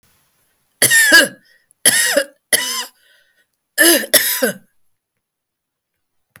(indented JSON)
{
  "cough_length": "6.4 s",
  "cough_amplitude": 32768,
  "cough_signal_mean_std_ratio": 0.4,
  "survey_phase": "beta (2021-08-13 to 2022-03-07)",
  "age": "65+",
  "gender": "Female",
  "wearing_mask": "No",
  "symptom_none": true,
  "smoker_status": "Never smoked",
  "respiratory_condition_asthma": false,
  "respiratory_condition_other": false,
  "recruitment_source": "REACT",
  "submission_delay": "1 day",
  "covid_test_result": "Negative",
  "covid_test_method": "RT-qPCR",
  "influenza_a_test_result": "Negative",
  "influenza_b_test_result": "Negative"
}